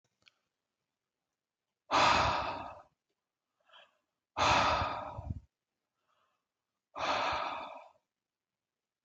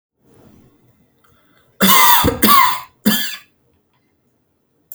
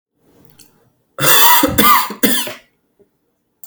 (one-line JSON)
{"exhalation_length": "9.0 s", "exhalation_amplitude": 6731, "exhalation_signal_mean_std_ratio": 0.39, "three_cough_length": "4.9 s", "three_cough_amplitude": 32768, "three_cough_signal_mean_std_ratio": 0.4, "cough_length": "3.7 s", "cough_amplitude": 32768, "cough_signal_mean_std_ratio": 0.46, "survey_phase": "alpha (2021-03-01 to 2021-08-12)", "age": "18-44", "gender": "Male", "wearing_mask": "No", "symptom_none": true, "smoker_status": "Never smoked", "respiratory_condition_asthma": false, "respiratory_condition_other": false, "recruitment_source": "REACT", "submission_delay": "7 days", "covid_test_result": "Negative", "covid_test_method": "RT-qPCR"}